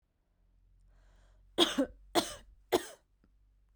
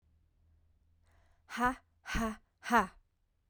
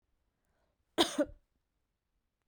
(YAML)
three_cough_length: 3.8 s
three_cough_amplitude: 8617
three_cough_signal_mean_std_ratio: 0.29
exhalation_length: 3.5 s
exhalation_amplitude: 6923
exhalation_signal_mean_std_ratio: 0.34
cough_length: 2.5 s
cough_amplitude: 8169
cough_signal_mean_std_ratio: 0.22
survey_phase: beta (2021-08-13 to 2022-03-07)
age: 18-44
gender: Female
wearing_mask: 'No'
symptom_cough_any: true
symptom_runny_or_blocked_nose: true
symptom_shortness_of_breath: true
symptom_sore_throat: true
symptom_fatigue: true
symptom_headache: true
symptom_loss_of_taste: true
smoker_status: Never smoked
respiratory_condition_asthma: false
respiratory_condition_other: false
recruitment_source: Test and Trace
submission_delay: 2 days
covid_test_result: Positive
covid_test_method: RT-qPCR
covid_ct_value: 17.5
covid_ct_gene: ORF1ab gene
covid_ct_mean: 18.0
covid_viral_load: 1200000 copies/ml
covid_viral_load_category: High viral load (>1M copies/ml)